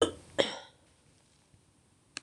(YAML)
cough_length: 2.2 s
cough_amplitude: 12709
cough_signal_mean_std_ratio: 0.26
survey_phase: beta (2021-08-13 to 2022-03-07)
age: 45-64
gender: Female
wearing_mask: 'No'
symptom_cough_any: true
symptom_runny_or_blocked_nose: true
symptom_shortness_of_breath: true
symptom_fatigue: true
symptom_headache: true
symptom_change_to_sense_of_smell_or_taste: true
symptom_onset: 2 days
smoker_status: Ex-smoker
respiratory_condition_asthma: true
respiratory_condition_other: false
recruitment_source: Test and Trace
submission_delay: 1 day
covid_test_result: Positive
covid_test_method: RT-qPCR
covid_ct_value: 18.9
covid_ct_gene: N gene